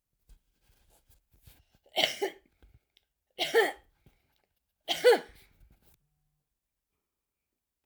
{"cough_length": "7.9 s", "cough_amplitude": 12917, "cough_signal_mean_std_ratio": 0.23, "survey_phase": "alpha (2021-03-01 to 2021-08-12)", "age": "65+", "gender": "Female", "wearing_mask": "No", "symptom_none": true, "smoker_status": "Never smoked", "respiratory_condition_asthma": true, "respiratory_condition_other": false, "recruitment_source": "REACT", "submission_delay": "1 day", "covid_test_result": "Negative", "covid_test_method": "RT-qPCR"}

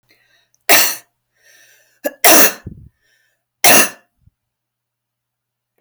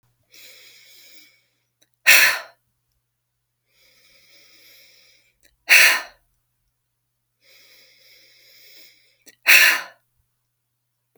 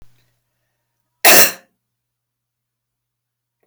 {"three_cough_length": "5.8 s", "three_cough_amplitude": 32768, "three_cough_signal_mean_std_ratio": 0.31, "exhalation_length": "11.2 s", "exhalation_amplitude": 32768, "exhalation_signal_mean_std_ratio": 0.24, "cough_length": "3.7 s", "cough_amplitude": 32768, "cough_signal_mean_std_ratio": 0.22, "survey_phase": "beta (2021-08-13 to 2022-03-07)", "age": "18-44", "gender": "Female", "wearing_mask": "No", "symptom_sore_throat": true, "smoker_status": "Never smoked", "respiratory_condition_asthma": false, "respiratory_condition_other": false, "recruitment_source": "REACT", "submission_delay": "2 days", "covid_test_result": "Negative", "covid_test_method": "RT-qPCR"}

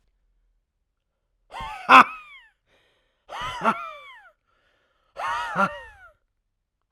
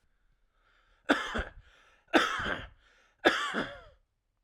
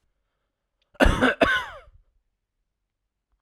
{"exhalation_length": "6.9 s", "exhalation_amplitude": 32768, "exhalation_signal_mean_std_ratio": 0.24, "three_cough_length": "4.4 s", "three_cough_amplitude": 13579, "three_cough_signal_mean_std_ratio": 0.38, "cough_length": "3.4 s", "cough_amplitude": 25587, "cough_signal_mean_std_ratio": 0.31, "survey_phase": "alpha (2021-03-01 to 2021-08-12)", "age": "18-44", "gender": "Male", "wearing_mask": "No", "symptom_none": true, "smoker_status": "Ex-smoker", "respiratory_condition_asthma": false, "respiratory_condition_other": false, "recruitment_source": "REACT", "submission_delay": "1 day", "covid_test_result": "Negative", "covid_test_method": "RT-qPCR"}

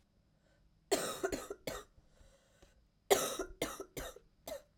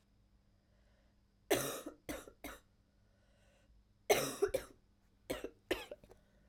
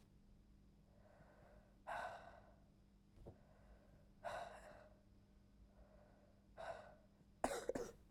{"cough_length": "4.8 s", "cough_amplitude": 8745, "cough_signal_mean_std_ratio": 0.38, "three_cough_length": "6.5 s", "three_cough_amplitude": 5431, "three_cough_signal_mean_std_ratio": 0.32, "exhalation_length": "8.1 s", "exhalation_amplitude": 2053, "exhalation_signal_mean_std_ratio": 0.47, "survey_phase": "alpha (2021-03-01 to 2021-08-12)", "age": "18-44", "gender": "Female", "wearing_mask": "No", "symptom_cough_any": true, "symptom_new_continuous_cough": true, "symptom_shortness_of_breath": true, "symptom_fatigue": true, "symptom_fever_high_temperature": true, "symptom_headache": true, "symptom_change_to_sense_of_smell_or_taste": true, "symptom_loss_of_taste": true, "symptom_onset": "4 days", "smoker_status": "Never smoked", "respiratory_condition_asthma": false, "respiratory_condition_other": false, "recruitment_source": "Test and Trace", "submission_delay": "2 days", "covid_test_result": "Positive", "covid_test_method": "RT-qPCR", "covid_ct_value": 13.0, "covid_ct_gene": "ORF1ab gene", "covid_ct_mean": 13.3, "covid_viral_load": "45000000 copies/ml", "covid_viral_load_category": "High viral load (>1M copies/ml)"}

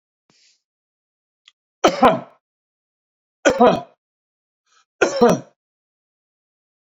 {"three_cough_length": "6.9 s", "three_cough_amplitude": 30651, "three_cough_signal_mean_std_ratio": 0.28, "survey_phase": "beta (2021-08-13 to 2022-03-07)", "age": "45-64", "gender": "Male", "wearing_mask": "No", "symptom_none": true, "smoker_status": "Never smoked", "respiratory_condition_asthma": false, "respiratory_condition_other": false, "recruitment_source": "REACT", "submission_delay": "2 days", "covid_test_result": "Negative", "covid_test_method": "RT-qPCR"}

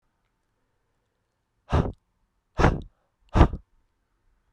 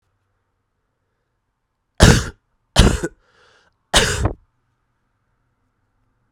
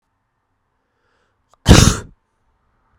{"exhalation_length": "4.5 s", "exhalation_amplitude": 28371, "exhalation_signal_mean_std_ratio": 0.25, "three_cough_length": "6.3 s", "three_cough_amplitude": 32768, "three_cough_signal_mean_std_ratio": 0.26, "cough_length": "3.0 s", "cough_amplitude": 32768, "cough_signal_mean_std_ratio": 0.23, "survey_phase": "beta (2021-08-13 to 2022-03-07)", "age": "18-44", "gender": "Male", "wearing_mask": "No", "symptom_cough_any": true, "symptom_runny_or_blocked_nose": true, "symptom_shortness_of_breath": true, "symptom_sore_throat": true, "symptom_fatigue": true, "symptom_headache": true, "symptom_change_to_sense_of_smell_or_taste": true, "symptom_loss_of_taste": true, "symptom_onset": "3 days", "smoker_status": "Never smoked", "respiratory_condition_asthma": false, "respiratory_condition_other": false, "recruitment_source": "Test and Trace", "submission_delay": "1 day", "covid_test_result": "Positive", "covid_test_method": "RT-qPCR"}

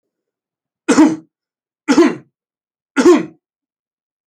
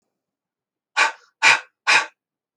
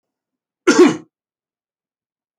{"three_cough_length": "4.3 s", "three_cough_amplitude": 28136, "three_cough_signal_mean_std_ratio": 0.35, "exhalation_length": "2.6 s", "exhalation_amplitude": 27403, "exhalation_signal_mean_std_ratio": 0.33, "cough_length": "2.4 s", "cough_amplitude": 27767, "cough_signal_mean_std_ratio": 0.27, "survey_phase": "beta (2021-08-13 to 2022-03-07)", "age": "65+", "gender": "Male", "wearing_mask": "No", "symptom_none": true, "symptom_onset": "5 days", "smoker_status": "Ex-smoker", "respiratory_condition_asthma": false, "respiratory_condition_other": false, "recruitment_source": "REACT", "submission_delay": "2 days", "covid_test_result": "Negative", "covid_test_method": "RT-qPCR"}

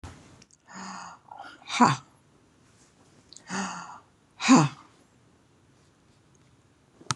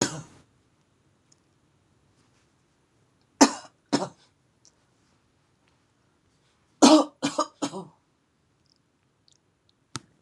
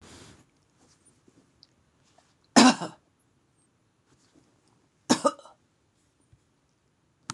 {"exhalation_length": "7.2 s", "exhalation_amplitude": 19152, "exhalation_signal_mean_std_ratio": 0.27, "three_cough_length": "10.2 s", "three_cough_amplitude": 26027, "three_cough_signal_mean_std_ratio": 0.2, "cough_length": "7.3 s", "cough_amplitude": 24734, "cough_signal_mean_std_ratio": 0.17, "survey_phase": "beta (2021-08-13 to 2022-03-07)", "age": "65+", "gender": "Female", "wearing_mask": "No", "symptom_none": true, "smoker_status": "Never smoked", "respiratory_condition_asthma": false, "respiratory_condition_other": false, "recruitment_source": "REACT", "submission_delay": "1 day", "covid_test_result": "Negative", "covid_test_method": "RT-qPCR", "influenza_a_test_result": "Negative", "influenza_b_test_result": "Negative"}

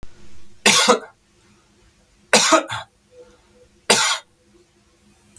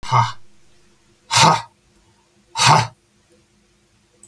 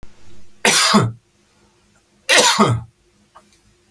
{"three_cough_length": "5.4 s", "three_cough_amplitude": 31797, "three_cough_signal_mean_std_ratio": 0.37, "exhalation_length": "4.3 s", "exhalation_amplitude": 31356, "exhalation_signal_mean_std_ratio": 0.36, "cough_length": "3.9 s", "cough_amplitude": 32768, "cough_signal_mean_std_ratio": 0.45, "survey_phase": "alpha (2021-03-01 to 2021-08-12)", "age": "45-64", "gender": "Male", "wearing_mask": "No", "symptom_none": true, "smoker_status": "Never smoked", "respiratory_condition_asthma": false, "respiratory_condition_other": false, "recruitment_source": "REACT", "submission_delay": "2 days", "covid_test_result": "Negative", "covid_test_method": "RT-qPCR"}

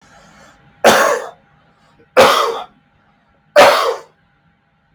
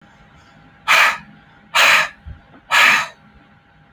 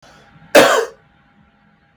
{"three_cough_length": "4.9 s", "three_cough_amplitude": 32767, "three_cough_signal_mean_std_ratio": 0.4, "exhalation_length": "3.9 s", "exhalation_amplitude": 30112, "exhalation_signal_mean_std_ratio": 0.43, "cough_length": "2.0 s", "cough_amplitude": 32767, "cough_signal_mean_std_ratio": 0.33, "survey_phase": "beta (2021-08-13 to 2022-03-07)", "age": "18-44", "gender": "Male", "wearing_mask": "No", "symptom_cough_any": true, "symptom_runny_or_blocked_nose": true, "symptom_shortness_of_breath": true, "symptom_sore_throat": true, "symptom_diarrhoea": true, "symptom_fatigue": true, "symptom_fever_high_temperature": true, "symptom_headache": true, "symptom_change_to_sense_of_smell_or_taste": true, "symptom_loss_of_taste": true, "smoker_status": "Never smoked", "respiratory_condition_asthma": true, "respiratory_condition_other": false, "recruitment_source": "Test and Trace", "submission_delay": "4 days", "covid_test_result": "Positive", "covid_test_method": "LFT"}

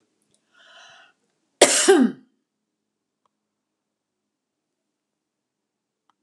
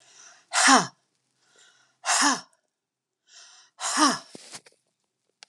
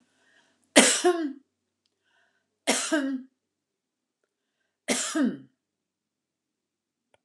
{"cough_length": "6.2 s", "cough_amplitude": 32750, "cough_signal_mean_std_ratio": 0.21, "exhalation_length": "5.5 s", "exhalation_amplitude": 24321, "exhalation_signal_mean_std_ratio": 0.33, "three_cough_length": "7.2 s", "three_cough_amplitude": 31931, "three_cough_signal_mean_std_ratio": 0.32, "survey_phase": "beta (2021-08-13 to 2022-03-07)", "age": "65+", "gender": "Female", "wearing_mask": "No", "symptom_none": true, "smoker_status": "Ex-smoker", "respiratory_condition_asthma": false, "respiratory_condition_other": false, "recruitment_source": "REACT", "submission_delay": "4 days", "covid_test_result": "Negative", "covid_test_method": "RT-qPCR", "influenza_a_test_result": "Negative", "influenza_b_test_result": "Negative"}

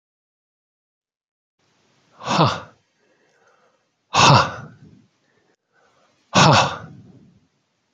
{"exhalation_length": "7.9 s", "exhalation_amplitude": 30136, "exhalation_signal_mean_std_ratio": 0.29, "survey_phase": "beta (2021-08-13 to 2022-03-07)", "age": "45-64", "gender": "Male", "wearing_mask": "No", "symptom_cough_any": true, "symptom_runny_or_blocked_nose": true, "symptom_fatigue": true, "symptom_fever_high_temperature": true, "symptom_change_to_sense_of_smell_or_taste": true, "symptom_loss_of_taste": true, "symptom_onset": "4 days", "smoker_status": "Never smoked", "respiratory_condition_asthma": false, "respiratory_condition_other": false, "recruitment_source": "Test and Trace", "submission_delay": "2 days", "covid_test_result": "Positive", "covid_test_method": "RT-qPCR", "covid_ct_value": 22.2, "covid_ct_gene": "N gene"}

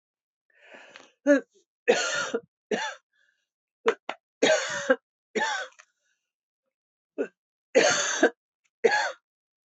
{"three_cough_length": "9.7 s", "three_cough_amplitude": 15601, "three_cough_signal_mean_std_ratio": 0.38, "survey_phase": "beta (2021-08-13 to 2022-03-07)", "age": "65+", "gender": "Female", "wearing_mask": "No", "symptom_cough_any": true, "symptom_runny_or_blocked_nose": true, "symptom_sore_throat": true, "symptom_fatigue": true, "symptom_headache": true, "symptom_other": true, "symptom_onset": "3 days", "smoker_status": "Never smoked", "respiratory_condition_asthma": false, "respiratory_condition_other": false, "recruitment_source": "Test and Trace", "submission_delay": "2 days", "covid_test_result": "Positive", "covid_test_method": "RT-qPCR", "covid_ct_value": 18.5, "covid_ct_gene": "ORF1ab gene"}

